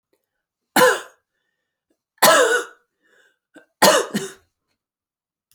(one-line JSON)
{"three_cough_length": "5.5 s", "three_cough_amplitude": 32768, "three_cough_signal_mean_std_ratio": 0.33, "survey_phase": "beta (2021-08-13 to 2022-03-07)", "age": "45-64", "gender": "Female", "wearing_mask": "No", "symptom_cough_any": true, "symptom_runny_or_blocked_nose": true, "symptom_fatigue": true, "symptom_headache": true, "symptom_onset": "3 days", "smoker_status": "Never smoked", "respiratory_condition_asthma": false, "respiratory_condition_other": false, "recruitment_source": "Test and Trace", "submission_delay": "2 days", "covid_test_result": "Positive", "covid_test_method": "ePCR"}